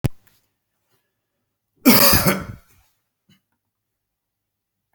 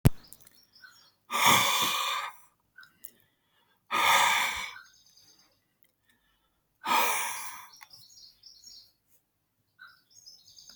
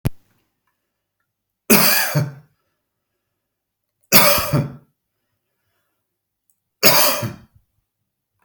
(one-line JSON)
{"cough_length": "4.9 s", "cough_amplitude": 32768, "cough_signal_mean_std_ratio": 0.27, "exhalation_length": "10.8 s", "exhalation_amplitude": 29095, "exhalation_signal_mean_std_ratio": 0.38, "three_cough_length": "8.4 s", "three_cough_amplitude": 32768, "three_cough_signal_mean_std_ratio": 0.33, "survey_phase": "alpha (2021-03-01 to 2021-08-12)", "age": "45-64", "gender": "Male", "wearing_mask": "No", "symptom_none": true, "smoker_status": "Never smoked", "respiratory_condition_asthma": false, "respiratory_condition_other": false, "recruitment_source": "REACT", "submission_delay": "2 days", "covid_test_result": "Negative", "covid_test_method": "RT-qPCR"}